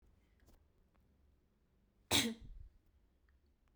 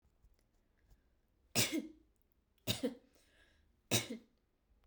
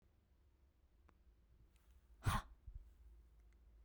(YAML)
cough_length: 3.8 s
cough_amplitude: 4300
cough_signal_mean_std_ratio: 0.24
three_cough_length: 4.9 s
three_cough_amplitude: 4228
three_cough_signal_mean_std_ratio: 0.3
exhalation_length: 3.8 s
exhalation_amplitude: 1697
exhalation_signal_mean_std_ratio: 0.29
survey_phase: beta (2021-08-13 to 2022-03-07)
age: 18-44
gender: Female
wearing_mask: 'No'
symptom_none: true
smoker_status: Never smoked
respiratory_condition_asthma: false
respiratory_condition_other: false
recruitment_source: REACT
submission_delay: 1 day
covid_test_result: Negative
covid_test_method: RT-qPCR